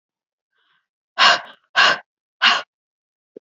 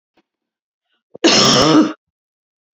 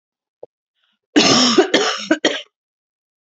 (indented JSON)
{
  "exhalation_length": "3.4 s",
  "exhalation_amplitude": 29819,
  "exhalation_signal_mean_std_ratio": 0.33,
  "cough_length": "2.7 s",
  "cough_amplitude": 32021,
  "cough_signal_mean_std_ratio": 0.42,
  "three_cough_length": "3.2 s",
  "three_cough_amplitude": 32768,
  "three_cough_signal_mean_std_ratio": 0.44,
  "survey_phase": "beta (2021-08-13 to 2022-03-07)",
  "age": "18-44",
  "gender": "Female",
  "wearing_mask": "No",
  "symptom_cough_any": true,
  "symptom_onset": "12 days",
  "smoker_status": "Never smoked",
  "respiratory_condition_asthma": false,
  "respiratory_condition_other": false,
  "recruitment_source": "REACT",
  "submission_delay": "1 day",
  "covid_test_result": "Negative",
  "covid_test_method": "RT-qPCR"
}